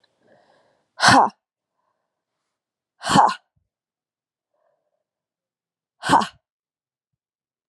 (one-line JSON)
{"exhalation_length": "7.7 s", "exhalation_amplitude": 28954, "exhalation_signal_mean_std_ratio": 0.23, "survey_phase": "alpha (2021-03-01 to 2021-08-12)", "age": "18-44", "gender": "Female", "wearing_mask": "No", "symptom_cough_any": true, "symptom_new_continuous_cough": true, "symptom_headache": true, "symptom_onset": "3 days", "smoker_status": "Never smoked", "respiratory_condition_asthma": false, "respiratory_condition_other": false, "recruitment_source": "Test and Trace", "submission_delay": "2 days", "covid_test_result": "Positive", "covid_test_method": "RT-qPCR"}